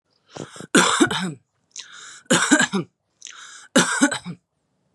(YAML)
three_cough_length: 4.9 s
three_cough_amplitude: 30809
three_cough_signal_mean_std_ratio: 0.43
survey_phase: beta (2021-08-13 to 2022-03-07)
age: 18-44
gender: Female
wearing_mask: 'No'
symptom_none: true
smoker_status: Current smoker (11 or more cigarettes per day)
respiratory_condition_asthma: false
respiratory_condition_other: false
recruitment_source: REACT
submission_delay: 0 days
covid_test_result: Negative
covid_test_method: RT-qPCR
influenza_a_test_result: Negative
influenza_b_test_result: Negative